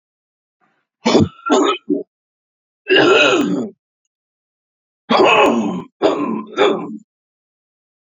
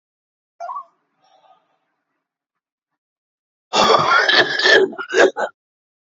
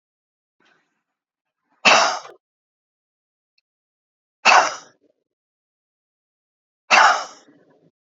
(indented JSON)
{
  "three_cough_length": "8.0 s",
  "three_cough_amplitude": 32768,
  "three_cough_signal_mean_std_ratio": 0.5,
  "cough_length": "6.1 s",
  "cough_amplitude": 30794,
  "cough_signal_mean_std_ratio": 0.4,
  "exhalation_length": "8.2 s",
  "exhalation_amplitude": 29475,
  "exhalation_signal_mean_std_ratio": 0.25,
  "survey_phase": "beta (2021-08-13 to 2022-03-07)",
  "age": "45-64",
  "gender": "Male",
  "wearing_mask": "No",
  "symptom_none": true,
  "smoker_status": "Current smoker (11 or more cigarettes per day)",
  "respiratory_condition_asthma": false,
  "respiratory_condition_other": false,
  "recruitment_source": "REACT",
  "submission_delay": "8 days",
  "covid_test_result": "Negative",
  "covid_test_method": "RT-qPCR",
  "influenza_a_test_result": "Negative",
  "influenza_b_test_result": "Negative"
}